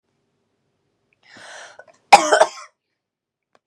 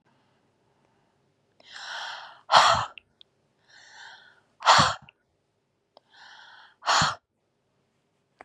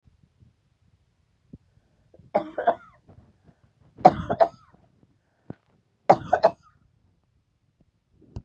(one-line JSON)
{"cough_length": "3.7 s", "cough_amplitude": 32768, "cough_signal_mean_std_ratio": 0.21, "exhalation_length": "8.4 s", "exhalation_amplitude": 22966, "exhalation_signal_mean_std_ratio": 0.28, "three_cough_length": "8.4 s", "three_cough_amplitude": 32409, "three_cough_signal_mean_std_ratio": 0.2, "survey_phase": "beta (2021-08-13 to 2022-03-07)", "age": "45-64", "gender": "Female", "wearing_mask": "No", "symptom_fatigue": true, "smoker_status": "Never smoked", "respiratory_condition_asthma": false, "respiratory_condition_other": false, "recruitment_source": "REACT", "submission_delay": "1 day", "covid_test_result": "Negative", "covid_test_method": "RT-qPCR", "influenza_a_test_result": "Negative", "influenza_b_test_result": "Negative"}